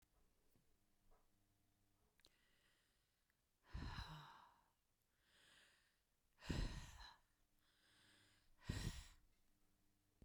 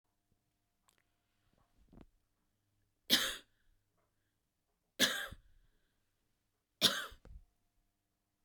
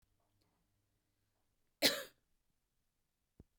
{"exhalation_length": "10.2 s", "exhalation_amplitude": 814, "exhalation_signal_mean_std_ratio": 0.34, "three_cough_length": "8.4 s", "three_cough_amplitude": 8374, "three_cough_signal_mean_std_ratio": 0.22, "cough_length": "3.6 s", "cough_amplitude": 5192, "cough_signal_mean_std_ratio": 0.17, "survey_phase": "beta (2021-08-13 to 2022-03-07)", "age": "45-64", "gender": "Female", "wearing_mask": "No", "symptom_cough_any": true, "symptom_sore_throat": true, "symptom_headache": true, "symptom_onset": "3 days", "smoker_status": "Never smoked", "respiratory_condition_asthma": false, "respiratory_condition_other": false, "recruitment_source": "REACT", "submission_delay": "2 days", "covid_test_result": "Negative", "covid_test_method": "RT-qPCR", "influenza_a_test_result": "Negative", "influenza_b_test_result": "Negative"}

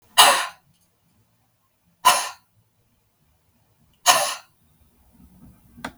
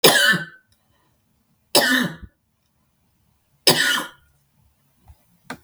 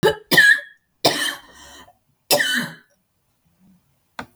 {"exhalation_length": "6.0 s", "exhalation_amplitude": 32768, "exhalation_signal_mean_std_ratio": 0.27, "three_cough_length": "5.6 s", "three_cough_amplitude": 32768, "three_cough_signal_mean_std_ratio": 0.35, "cough_length": "4.4 s", "cough_amplitude": 27316, "cough_signal_mean_std_ratio": 0.39, "survey_phase": "beta (2021-08-13 to 2022-03-07)", "age": "45-64", "gender": "Female", "wearing_mask": "No", "symptom_none": true, "smoker_status": "Never smoked", "respiratory_condition_asthma": false, "respiratory_condition_other": false, "recruitment_source": "REACT", "submission_delay": "3 days", "covid_test_result": "Negative", "covid_test_method": "RT-qPCR", "influenza_a_test_result": "Negative", "influenza_b_test_result": "Negative"}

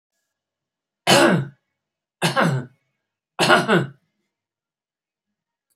{"three_cough_length": "5.8 s", "three_cough_amplitude": 29018, "three_cough_signal_mean_std_ratio": 0.36, "survey_phase": "beta (2021-08-13 to 2022-03-07)", "age": "65+", "gender": "Male", "wearing_mask": "No", "symptom_cough_any": true, "symptom_sore_throat": true, "smoker_status": "Ex-smoker", "respiratory_condition_asthma": true, "respiratory_condition_other": false, "recruitment_source": "REACT", "submission_delay": "5 days", "covid_test_result": "Negative", "covid_test_method": "RT-qPCR", "influenza_a_test_result": "Negative", "influenza_b_test_result": "Negative"}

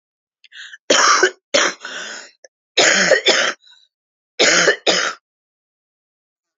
{"three_cough_length": "6.6 s", "three_cough_amplitude": 30936, "three_cough_signal_mean_std_ratio": 0.46, "survey_phase": "alpha (2021-03-01 to 2021-08-12)", "age": "45-64", "gender": "Female", "wearing_mask": "No", "symptom_cough_any": true, "symptom_shortness_of_breath": true, "symptom_fatigue": true, "symptom_headache": true, "symptom_onset": "4 days", "smoker_status": "Never smoked", "respiratory_condition_asthma": true, "respiratory_condition_other": false, "recruitment_source": "Test and Trace", "submission_delay": "2 days", "covid_test_result": "Positive", "covid_test_method": "RT-qPCR", "covid_ct_value": 27.4, "covid_ct_gene": "ORF1ab gene"}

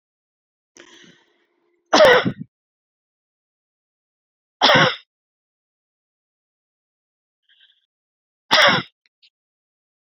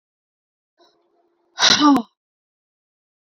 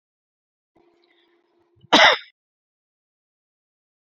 {"three_cough_length": "10.1 s", "three_cough_amplitude": 31237, "three_cough_signal_mean_std_ratio": 0.25, "exhalation_length": "3.2 s", "exhalation_amplitude": 30251, "exhalation_signal_mean_std_ratio": 0.29, "cough_length": "4.2 s", "cough_amplitude": 31960, "cough_signal_mean_std_ratio": 0.19, "survey_phase": "beta (2021-08-13 to 2022-03-07)", "age": "45-64", "gender": "Female", "wearing_mask": "No", "symptom_cough_any": true, "symptom_shortness_of_breath": true, "symptom_fatigue": true, "symptom_headache": true, "symptom_onset": "12 days", "smoker_status": "Current smoker (e-cigarettes or vapes only)", "respiratory_condition_asthma": true, "respiratory_condition_other": false, "recruitment_source": "REACT", "submission_delay": "1 day", "covid_test_result": "Negative", "covid_test_method": "RT-qPCR"}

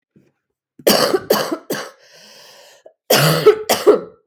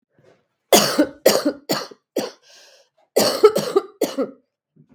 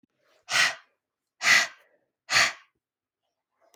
{"cough_length": "4.3 s", "cough_amplitude": 32766, "cough_signal_mean_std_ratio": 0.46, "three_cough_length": "4.9 s", "three_cough_amplitude": 32766, "three_cough_signal_mean_std_ratio": 0.41, "exhalation_length": "3.8 s", "exhalation_amplitude": 14578, "exhalation_signal_mean_std_ratio": 0.33, "survey_phase": "beta (2021-08-13 to 2022-03-07)", "age": "18-44", "gender": "Female", "wearing_mask": "No", "symptom_cough_any": true, "symptom_onset": "3 days", "smoker_status": "Prefer not to say", "respiratory_condition_asthma": false, "respiratory_condition_other": false, "recruitment_source": "Test and Trace", "submission_delay": "1 day", "covid_test_result": "Negative", "covid_test_method": "ePCR"}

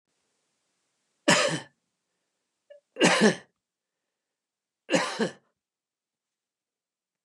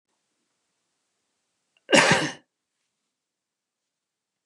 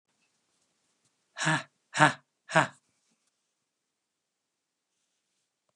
{"three_cough_length": "7.2 s", "three_cough_amplitude": 16090, "three_cough_signal_mean_std_ratio": 0.28, "cough_length": "4.5 s", "cough_amplitude": 25516, "cough_signal_mean_std_ratio": 0.22, "exhalation_length": "5.8 s", "exhalation_amplitude": 22015, "exhalation_signal_mean_std_ratio": 0.2, "survey_phase": "beta (2021-08-13 to 2022-03-07)", "age": "45-64", "gender": "Male", "wearing_mask": "No", "symptom_none": true, "smoker_status": "Ex-smoker", "respiratory_condition_asthma": false, "respiratory_condition_other": false, "recruitment_source": "REACT", "submission_delay": "1 day", "covid_test_result": "Negative", "covid_test_method": "RT-qPCR"}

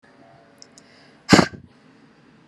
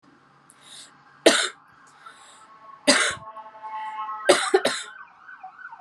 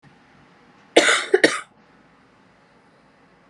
{"exhalation_length": "2.5 s", "exhalation_amplitude": 32768, "exhalation_signal_mean_std_ratio": 0.2, "three_cough_length": "5.8 s", "three_cough_amplitude": 28232, "three_cough_signal_mean_std_ratio": 0.38, "cough_length": "3.5 s", "cough_amplitude": 32159, "cough_signal_mean_std_ratio": 0.27, "survey_phase": "beta (2021-08-13 to 2022-03-07)", "age": "18-44", "gender": "Female", "wearing_mask": "No", "symptom_cough_any": true, "symptom_runny_or_blocked_nose": true, "symptom_sore_throat": true, "symptom_change_to_sense_of_smell_or_taste": true, "symptom_loss_of_taste": true, "smoker_status": "Never smoked", "respiratory_condition_asthma": true, "respiratory_condition_other": false, "recruitment_source": "Test and Trace", "submission_delay": "1 day", "covid_test_result": "Positive", "covid_test_method": "RT-qPCR"}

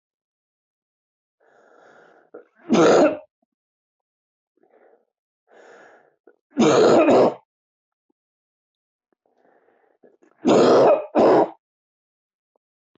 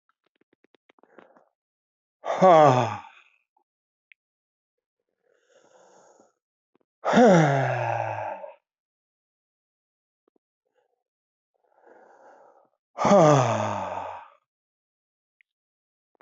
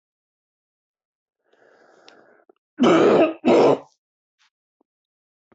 {"three_cough_length": "13.0 s", "three_cough_amplitude": 19410, "three_cough_signal_mean_std_ratio": 0.35, "exhalation_length": "16.2 s", "exhalation_amplitude": 18351, "exhalation_signal_mean_std_ratio": 0.3, "cough_length": "5.5 s", "cough_amplitude": 18033, "cough_signal_mean_std_ratio": 0.33, "survey_phase": "beta (2021-08-13 to 2022-03-07)", "age": "45-64", "gender": "Male", "wearing_mask": "No", "symptom_cough_any": true, "symptom_runny_or_blocked_nose": true, "symptom_headache": true, "symptom_change_to_sense_of_smell_or_taste": true, "symptom_onset": "4 days", "smoker_status": "Never smoked", "respiratory_condition_asthma": false, "respiratory_condition_other": false, "recruitment_source": "Test and Trace", "submission_delay": "2 days", "covid_test_result": "Positive", "covid_test_method": "ePCR"}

